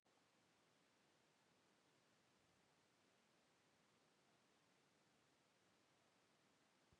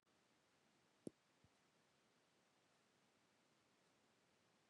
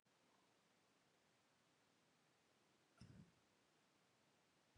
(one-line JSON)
{"exhalation_length": "7.0 s", "exhalation_amplitude": 20, "exhalation_signal_mean_std_ratio": 1.09, "three_cough_length": "4.7 s", "three_cough_amplitude": 476, "three_cough_signal_mean_std_ratio": 0.32, "cough_length": "4.8 s", "cough_amplitude": 99, "cough_signal_mean_std_ratio": 0.66, "survey_phase": "beta (2021-08-13 to 2022-03-07)", "age": "18-44", "gender": "Male", "wearing_mask": "No", "symptom_none": true, "smoker_status": "Never smoked", "respiratory_condition_asthma": false, "respiratory_condition_other": false, "recruitment_source": "REACT", "submission_delay": "2 days", "covid_test_result": "Negative", "covid_test_method": "RT-qPCR"}